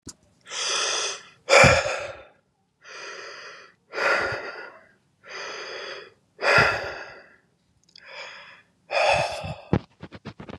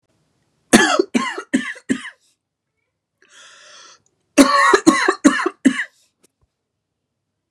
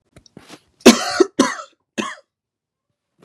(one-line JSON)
{"exhalation_length": "10.6 s", "exhalation_amplitude": 27114, "exhalation_signal_mean_std_ratio": 0.43, "cough_length": "7.5 s", "cough_amplitude": 32768, "cough_signal_mean_std_ratio": 0.36, "three_cough_length": "3.2 s", "three_cough_amplitude": 32768, "three_cough_signal_mean_std_ratio": 0.27, "survey_phase": "beta (2021-08-13 to 2022-03-07)", "age": "18-44", "gender": "Male", "wearing_mask": "No", "symptom_cough_any": true, "symptom_fatigue": true, "symptom_other": true, "symptom_onset": "4 days", "smoker_status": "Current smoker (1 to 10 cigarettes per day)", "respiratory_condition_asthma": false, "respiratory_condition_other": false, "recruitment_source": "Test and Trace", "submission_delay": "2 days", "covid_test_result": "Positive", "covid_test_method": "ePCR"}